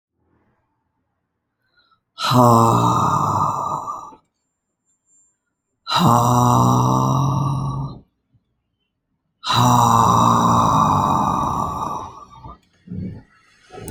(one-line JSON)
{"exhalation_length": "13.9 s", "exhalation_amplitude": 29689, "exhalation_signal_mean_std_ratio": 0.59, "survey_phase": "alpha (2021-03-01 to 2021-08-12)", "age": "45-64", "gender": "Female", "wearing_mask": "No", "symptom_cough_any": true, "symptom_change_to_sense_of_smell_or_taste": true, "symptom_loss_of_taste": true, "symptom_onset": "5 days", "smoker_status": "Never smoked", "respiratory_condition_asthma": false, "respiratory_condition_other": false, "recruitment_source": "Test and Trace", "submission_delay": "1 day", "covid_test_result": "Positive", "covid_test_method": "RT-qPCR"}